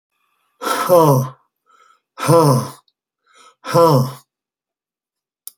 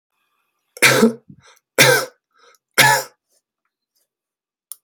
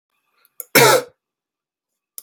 {"exhalation_length": "5.6 s", "exhalation_amplitude": 29994, "exhalation_signal_mean_std_ratio": 0.42, "three_cough_length": "4.8 s", "three_cough_amplitude": 32768, "three_cough_signal_mean_std_ratio": 0.33, "cough_length": "2.2 s", "cough_amplitude": 32768, "cough_signal_mean_std_ratio": 0.28, "survey_phase": "beta (2021-08-13 to 2022-03-07)", "age": "45-64", "gender": "Male", "wearing_mask": "No", "symptom_none": true, "smoker_status": "Never smoked", "respiratory_condition_asthma": false, "respiratory_condition_other": false, "recruitment_source": "REACT", "submission_delay": "1 day", "covid_test_result": "Negative", "covid_test_method": "RT-qPCR"}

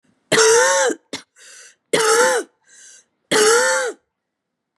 {"three_cough_length": "4.8 s", "three_cough_amplitude": 28028, "three_cough_signal_mean_std_ratio": 0.55, "survey_phase": "beta (2021-08-13 to 2022-03-07)", "age": "45-64", "gender": "Female", "wearing_mask": "No", "symptom_cough_any": true, "symptom_runny_or_blocked_nose": true, "symptom_fatigue": true, "symptom_change_to_sense_of_smell_or_taste": true, "symptom_loss_of_taste": true, "symptom_onset": "6 days", "smoker_status": "Ex-smoker", "respiratory_condition_asthma": false, "respiratory_condition_other": false, "recruitment_source": "REACT", "submission_delay": "0 days", "covid_test_result": "Positive", "covid_test_method": "RT-qPCR", "covid_ct_value": 18.7, "covid_ct_gene": "E gene", "influenza_a_test_result": "Negative", "influenza_b_test_result": "Negative"}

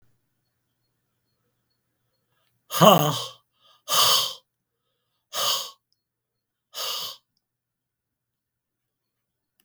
{"exhalation_length": "9.6 s", "exhalation_amplitude": 32766, "exhalation_signal_mean_std_ratio": 0.26, "survey_phase": "beta (2021-08-13 to 2022-03-07)", "age": "65+", "gender": "Male", "wearing_mask": "No", "symptom_cough_any": true, "symptom_runny_or_blocked_nose": true, "symptom_onset": "3 days", "smoker_status": "Never smoked", "respiratory_condition_asthma": false, "respiratory_condition_other": false, "recruitment_source": "Test and Trace", "submission_delay": "2 days", "covid_test_result": "Positive", "covid_test_method": "RT-qPCR", "covid_ct_value": 16.2, "covid_ct_gene": "ORF1ab gene", "covid_ct_mean": 16.3, "covid_viral_load": "4400000 copies/ml", "covid_viral_load_category": "High viral load (>1M copies/ml)"}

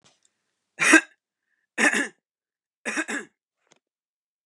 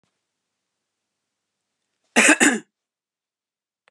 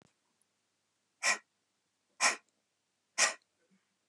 {"three_cough_length": "4.5 s", "three_cough_amplitude": 29000, "three_cough_signal_mean_std_ratio": 0.28, "cough_length": "3.9 s", "cough_amplitude": 31965, "cough_signal_mean_std_ratio": 0.24, "exhalation_length": "4.1 s", "exhalation_amplitude": 7269, "exhalation_signal_mean_std_ratio": 0.25, "survey_phase": "beta (2021-08-13 to 2022-03-07)", "age": "65+", "gender": "Female", "wearing_mask": "No", "symptom_none": true, "smoker_status": "Never smoked", "respiratory_condition_asthma": false, "respiratory_condition_other": false, "recruitment_source": "Test and Trace", "submission_delay": "0 days", "covid_test_result": "Negative", "covid_test_method": "LFT"}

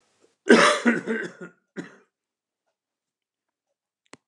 {"cough_length": "4.3 s", "cough_amplitude": 27706, "cough_signal_mean_std_ratio": 0.28, "survey_phase": "alpha (2021-03-01 to 2021-08-12)", "age": "65+", "gender": "Male", "wearing_mask": "No", "symptom_none": true, "smoker_status": "Current smoker (1 to 10 cigarettes per day)", "respiratory_condition_asthma": false, "respiratory_condition_other": false, "recruitment_source": "REACT", "submission_delay": "8 days", "covid_test_result": "Negative", "covid_test_method": "RT-qPCR"}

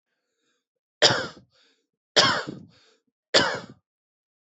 {"three_cough_length": "4.5 s", "three_cough_amplitude": 26750, "three_cough_signal_mean_std_ratio": 0.3, "survey_phase": "alpha (2021-03-01 to 2021-08-12)", "age": "45-64", "gender": "Male", "wearing_mask": "No", "symptom_none": true, "smoker_status": "Current smoker (1 to 10 cigarettes per day)", "respiratory_condition_asthma": true, "respiratory_condition_other": false, "recruitment_source": "REACT", "submission_delay": "1 day", "covid_test_result": "Negative", "covid_test_method": "RT-qPCR"}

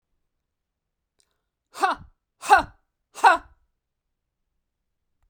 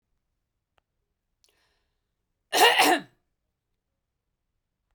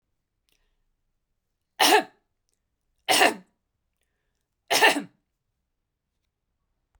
{"exhalation_length": "5.3 s", "exhalation_amplitude": 26715, "exhalation_signal_mean_std_ratio": 0.21, "cough_length": "4.9 s", "cough_amplitude": 19562, "cough_signal_mean_std_ratio": 0.24, "three_cough_length": "7.0 s", "three_cough_amplitude": 21933, "three_cough_signal_mean_std_ratio": 0.26, "survey_phase": "beta (2021-08-13 to 2022-03-07)", "age": "45-64", "gender": "Female", "wearing_mask": "No", "symptom_none": true, "smoker_status": "Never smoked", "respiratory_condition_asthma": false, "respiratory_condition_other": false, "recruitment_source": "REACT", "submission_delay": "0 days", "covid_test_result": "Negative", "covid_test_method": "RT-qPCR"}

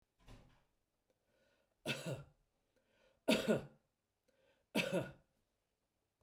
{"three_cough_length": "6.2 s", "three_cough_amplitude": 3183, "three_cough_signal_mean_std_ratio": 0.3, "survey_phase": "beta (2021-08-13 to 2022-03-07)", "age": "65+", "gender": "Male", "wearing_mask": "No", "symptom_none": true, "smoker_status": "Never smoked", "respiratory_condition_asthma": false, "respiratory_condition_other": false, "recruitment_source": "REACT", "submission_delay": "3 days", "covid_test_result": "Negative", "covid_test_method": "RT-qPCR", "influenza_a_test_result": "Negative", "influenza_b_test_result": "Negative"}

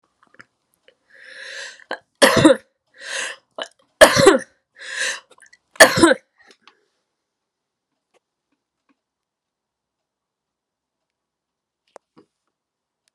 {"three_cough_length": "13.1 s", "three_cough_amplitude": 32768, "three_cough_signal_mean_std_ratio": 0.23, "survey_phase": "alpha (2021-03-01 to 2021-08-12)", "age": "45-64", "gender": "Female", "wearing_mask": "Yes", "symptom_shortness_of_breath": true, "symptom_fatigue": true, "symptom_onset": "12 days", "smoker_status": "Ex-smoker", "respiratory_condition_asthma": false, "respiratory_condition_other": false, "recruitment_source": "REACT", "submission_delay": "1 day", "covid_test_result": "Negative", "covid_test_method": "RT-qPCR"}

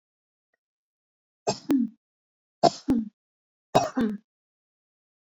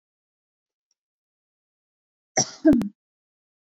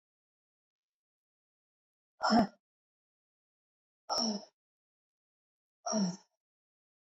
{"three_cough_length": "5.3 s", "three_cough_amplitude": 18431, "three_cough_signal_mean_std_ratio": 0.31, "cough_length": "3.7 s", "cough_amplitude": 17327, "cough_signal_mean_std_ratio": 0.23, "exhalation_length": "7.2 s", "exhalation_amplitude": 5372, "exhalation_signal_mean_std_ratio": 0.26, "survey_phase": "beta (2021-08-13 to 2022-03-07)", "age": "45-64", "gender": "Female", "wearing_mask": "No", "symptom_none": true, "smoker_status": "Ex-smoker", "respiratory_condition_asthma": false, "respiratory_condition_other": false, "recruitment_source": "REACT", "submission_delay": "3 days", "covid_test_result": "Negative", "covid_test_method": "RT-qPCR"}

